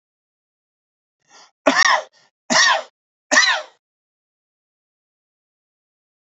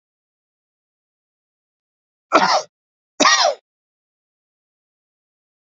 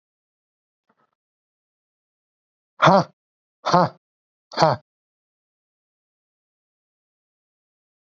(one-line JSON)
{"three_cough_length": "6.2 s", "three_cough_amplitude": 29085, "three_cough_signal_mean_std_ratio": 0.3, "cough_length": "5.7 s", "cough_amplitude": 32768, "cough_signal_mean_std_ratio": 0.26, "exhalation_length": "8.0 s", "exhalation_amplitude": 27526, "exhalation_signal_mean_std_ratio": 0.2, "survey_phase": "beta (2021-08-13 to 2022-03-07)", "age": "18-44", "gender": "Male", "wearing_mask": "No", "symptom_fatigue": true, "symptom_other": true, "smoker_status": "Ex-smoker", "respiratory_condition_asthma": true, "respiratory_condition_other": false, "recruitment_source": "REACT", "submission_delay": "5 days", "covid_test_result": "Negative", "covid_test_method": "RT-qPCR", "influenza_a_test_result": "Negative", "influenza_b_test_result": "Negative"}